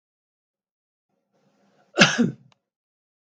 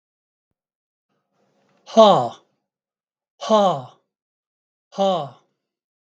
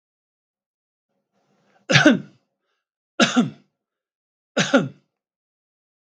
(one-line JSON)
{"cough_length": "3.3 s", "cough_amplitude": 32766, "cough_signal_mean_std_ratio": 0.22, "exhalation_length": "6.1 s", "exhalation_amplitude": 32734, "exhalation_signal_mean_std_ratio": 0.29, "three_cough_length": "6.1 s", "three_cough_amplitude": 32768, "three_cough_signal_mean_std_ratio": 0.27, "survey_phase": "beta (2021-08-13 to 2022-03-07)", "age": "65+", "gender": "Male", "wearing_mask": "No", "symptom_none": true, "smoker_status": "Never smoked", "respiratory_condition_asthma": false, "respiratory_condition_other": false, "recruitment_source": "REACT", "submission_delay": "2 days", "covid_test_result": "Negative", "covid_test_method": "RT-qPCR", "influenza_a_test_result": "Negative", "influenza_b_test_result": "Negative"}